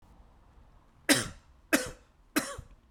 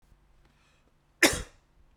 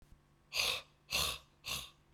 {
  "three_cough_length": "2.9 s",
  "three_cough_amplitude": 19557,
  "three_cough_signal_mean_std_ratio": 0.31,
  "cough_length": "2.0 s",
  "cough_amplitude": 20853,
  "cough_signal_mean_std_ratio": 0.21,
  "exhalation_length": "2.1 s",
  "exhalation_amplitude": 3907,
  "exhalation_signal_mean_std_ratio": 0.49,
  "survey_phase": "beta (2021-08-13 to 2022-03-07)",
  "age": "45-64",
  "gender": "Male",
  "wearing_mask": "No",
  "symptom_sore_throat": true,
  "symptom_fatigue": true,
  "symptom_headache": true,
  "symptom_onset": "7 days",
  "smoker_status": "Never smoked",
  "respiratory_condition_asthma": false,
  "respiratory_condition_other": false,
  "recruitment_source": "Test and Trace",
  "submission_delay": "2 days",
  "covid_test_result": "Positive",
  "covid_test_method": "RT-qPCR",
  "covid_ct_value": 21.2,
  "covid_ct_gene": "N gene"
}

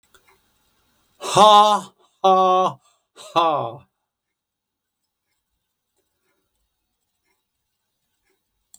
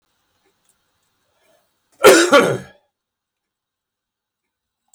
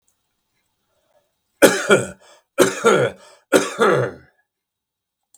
{
  "exhalation_length": "8.8 s",
  "exhalation_amplitude": 32766,
  "exhalation_signal_mean_std_ratio": 0.29,
  "cough_length": "4.9 s",
  "cough_amplitude": 32768,
  "cough_signal_mean_std_ratio": 0.25,
  "three_cough_length": "5.4 s",
  "three_cough_amplitude": 32768,
  "three_cough_signal_mean_std_ratio": 0.38,
  "survey_phase": "beta (2021-08-13 to 2022-03-07)",
  "age": "45-64",
  "gender": "Male",
  "wearing_mask": "No",
  "symptom_none": true,
  "smoker_status": "Never smoked",
  "respiratory_condition_asthma": false,
  "respiratory_condition_other": false,
  "recruitment_source": "REACT",
  "submission_delay": "1 day",
  "covid_test_result": "Negative",
  "covid_test_method": "RT-qPCR",
  "influenza_a_test_result": "Negative",
  "influenza_b_test_result": "Negative"
}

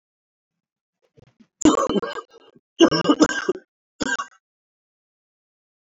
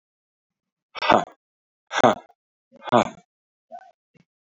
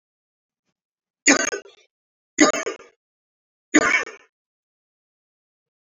{
  "cough_length": "5.9 s",
  "cough_amplitude": 25178,
  "cough_signal_mean_std_ratio": 0.31,
  "exhalation_length": "4.5 s",
  "exhalation_amplitude": 27089,
  "exhalation_signal_mean_std_ratio": 0.25,
  "three_cough_length": "5.9 s",
  "three_cough_amplitude": 31578,
  "three_cough_signal_mean_std_ratio": 0.26,
  "survey_phase": "beta (2021-08-13 to 2022-03-07)",
  "age": "45-64",
  "gender": "Male",
  "wearing_mask": "No",
  "symptom_cough_any": true,
  "symptom_runny_or_blocked_nose": true,
  "symptom_shortness_of_breath": true,
  "symptom_sore_throat": true,
  "symptom_diarrhoea": true,
  "symptom_fatigue": true,
  "symptom_onset": "4 days",
  "smoker_status": "Ex-smoker",
  "respiratory_condition_asthma": false,
  "respiratory_condition_other": false,
  "recruitment_source": "Test and Trace",
  "submission_delay": "1 day",
  "covid_test_result": "Positive",
  "covid_test_method": "ePCR"
}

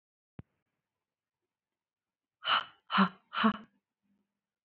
{
  "exhalation_length": "4.6 s",
  "exhalation_amplitude": 6975,
  "exhalation_signal_mean_std_ratio": 0.26,
  "survey_phase": "beta (2021-08-13 to 2022-03-07)",
  "age": "18-44",
  "gender": "Female",
  "wearing_mask": "No",
  "symptom_fatigue": true,
  "symptom_onset": "12 days",
  "smoker_status": "Never smoked",
  "respiratory_condition_asthma": false,
  "respiratory_condition_other": true,
  "recruitment_source": "REACT",
  "submission_delay": "3 days",
  "covid_test_result": "Negative",
  "covid_test_method": "RT-qPCR"
}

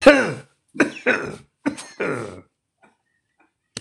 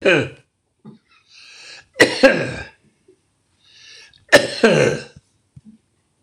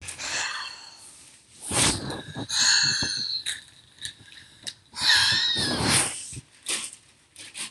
{
  "cough_length": "3.8 s",
  "cough_amplitude": 26028,
  "cough_signal_mean_std_ratio": 0.33,
  "three_cough_length": "6.2 s",
  "three_cough_amplitude": 26028,
  "three_cough_signal_mean_std_ratio": 0.34,
  "exhalation_length": "7.7 s",
  "exhalation_amplitude": 16000,
  "exhalation_signal_mean_std_ratio": 0.61,
  "survey_phase": "beta (2021-08-13 to 2022-03-07)",
  "age": "65+",
  "gender": "Male",
  "wearing_mask": "No",
  "symptom_none": true,
  "smoker_status": "Ex-smoker",
  "respiratory_condition_asthma": true,
  "respiratory_condition_other": false,
  "recruitment_source": "REACT",
  "submission_delay": "2 days",
  "covid_test_result": "Negative",
  "covid_test_method": "RT-qPCR",
  "influenza_a_test_result": "Negative",
  "influenza_b_test_result": "Negative"
}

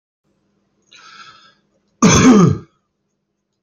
{
  "cough_length": "3.6 s",
  "cough_amplitude": 32767,
  "cough_signal_mean_std_ratio": 0.34,
  "survey_phase": "alpha (2021-03-01 to 2021-08-12)",
  "age": "45-64",
  "gender": "Male",
  "wearing_mask": "No",
  "symptom_none": true,
  "smoker_status": "Ex-smoker",
  "respiratory_condition_asthma": false,
  "respiratory_condition_other": false,
  "recruitment_source": "REACT",
  "submission_delay": "5 days",
  "covid_test_result": "Negative",
  "covid_test_method": "RT-qPCR"
}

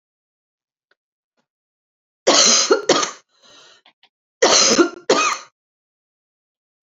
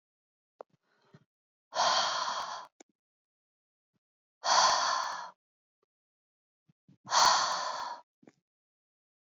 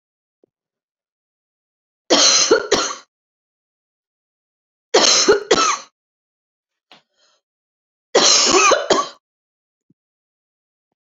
{
  "cough_length": "6.8 s",
  "cough_amplitude": 32768,
  "cough_signal_mean_std_ratio": 0.37,
  "exhalation_length": "9.4 s",
  "exhalation_amplitude": 9423,
  "exhalation_signal_mean_std_ratio": 0.38,
  "three_cough_length": "11.0 s",
  "three_cough_amplitude": 32768,
  "three_cough_signal_mean_std_ratio": 0.37,
  "survey_phase": "beta (2021-08-13 to 2022-03-07)",
  "age": "18-44",
  "gender": "Female",
  "wearing_mask": "No",
  "symptom_new_continuous_cough": true,
  "symptom_runny_or_blocked_nose": true,
  "symptom_sore_throat": true,
  "smoker_status": "Never smoked",
  "respiratory_condition_asthma": false,
  "respiratory_condition_other": false,
  "recruitment_source": "Test and Trace",
  "submission_delay": "1 day",
  "covid_test_result": "Positive",
  "covid_test_method": "RT-qPCR",
  "covid_ct_value": 29.2,
  "covid_ct_gene": "ORF1ab gene"
}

